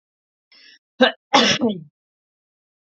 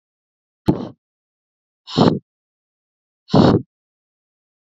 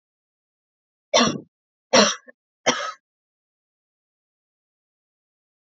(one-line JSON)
{"cough_length": "2.8 s", "cough_amplitude": 28304, "cough_signal_mean_std_ratio": 0.33, "exhalation_length": "4.6 s", "exhalation_amplitude": 32767, "exhalation_signal_mean_std_ratio": 0.28, "three_cough_length": "5.7 s", "three_cough_amplitude": 26000, "three_cough_signal_mean_std_ratio": 0.24, "survey_phase": "beta (2021-08-13 to 2022-03-07)", "age": "18-44", "gender": "Female", "wearing_mask": "No", "symptom_none": true, "smoker_status": "Never smoked", "respiratory_condition_asthma": false, "respiratory_condition_other": false, "recruitment_source": "REACT", "submission_delay": "8 days", "covid_test_result": "Negative", "covid_test_method": "RT-qPCR", "influenza_a_test_result": "Negative", "influenza_b_test_result": "Negative"}